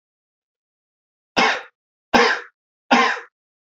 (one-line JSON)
{"three_cough_length": "3.8 s", "three_cough_amplitude": 27734, "three_cough_signal_mean_std_ratio": 0.35, "survey_phase": "beta (2021-08-13 to 2022-03-07)", "age": "18-44", "gender": "Male", "wearing_mask": "No", "symptom_cough_any": true, "symptom_runny_or_blocked_nose": true, "symptom_shortness_of_breath": true, "symptom_fatigue": true, "symptom_fever_high_temperature": true, "symptom_headache": true, "smoker_status": "Never smoked", "respiratory_condition_asthma": false, "respiratory_condition_other": false, "recruitment_source": "Test and Trace", "submission_delay": "-1 day", "covid_test_result": "Positive", "covid_test_method": "LFT"}